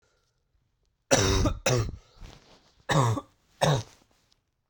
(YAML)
cough_length: 4.7 s
cough_amplitude: 23794
cough_signal_mean_std_ratio: 0.43
survey_phase: beta (2021-08-13 to 2022-03-07)
age: 18-44
gender: Male
wearing_mask: 'No'
symptom_cough_any: true
symptom_new_continuous_cough: true
symptom_runny_or_blocked_nose: true
symptom_shortness_of_breath: true
symptom_sore_throat: true
symptom_fatigue: true
symptom_fever_high_temperature: true
symptom_headache: true
symptom_onset: 6 days
smoker_status: Never smoked
respiratory_condition_asthma: false
respiratory_condition_other: false
recruitment_source: Test and Trace
submission_delay: 2 days
covid_test_result: Positive
covid_test_method: RT-qPCR